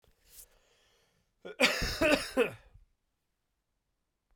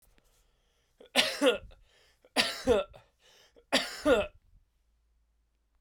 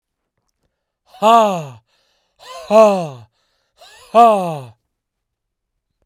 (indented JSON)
{
  "cough_length": "4.4 s",
  "cough_amplitude": 10672,
  "cough_signal_mean_std_ratio": 0.33,
  "three_cough_length": "5.8 s",
  "three_cough_amplitude": 10590,
  "three_cough_signal_mean_std_ratio": 0.35,
  "exhalation_length": "6.1 s",
  "exhalation_amplitude": 32767,
  "exhalation_signal_mean_std_ratio": 0.36,
  "survey_phase": "beta (2021-08-13 to 2022-03-07)",
  "age": "18-44",
  "gender": "Male",
  "wearing_mask": "No",
  "symptom_cough_any": true,
  "symptom_runny_or_blocked_nose": true,
  "symptom_sore_throat": true,
  "symptom_fatigue": true,
  "symptom_headache": true,
  "symptom_onset": "3 days",
  "smoker_status": "Ex-smoker",
  "respiratory_condition_asthma": false,
  "respiratory_condition_other": false,
  "recruitment_source": "Test and Trace",
  "submission_delay": "2 days",
  "covid_test_result": "Positive",
  "covid_test_method": "RT-qPCR",
  "covid_ct_value": 15.5,
  "covid_ct_gene": "ORF1ab gene",
  "covid_ct_mean": 15.6,
  "covid_viral_load": "7400000 copies/ml",
  "covid_viral_load_category": "High viral load (>1M copies/ml)"
}